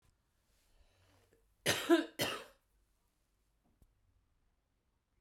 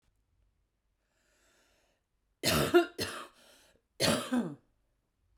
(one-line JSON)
{"cough_length": "5.2 s", "cough_amplitude": 5180, "cough_signal_mean_std_ratio": 0.24, "three_cough_length": "5.4 s", "three_cough_amplitude": 8559, "three_cough_signal_mean_std_ratio": 0.33, "survey_phase": "beta (2021-08-13 to 2022-03-07)", "age": "45-64", "gender": "Female", "wearing_mask": "No", "symptom_headache": true, "smoker_status": "Current smoker (1 to 10 cigarettes per day)", "respiratory_condition_asthma": false, "respiratory_condition_other": false, "recruitment_source": "REACT", "submission_delay": "2 days", "covid_test_result": "Negative", "covid_test_method": "RT-qPCR"}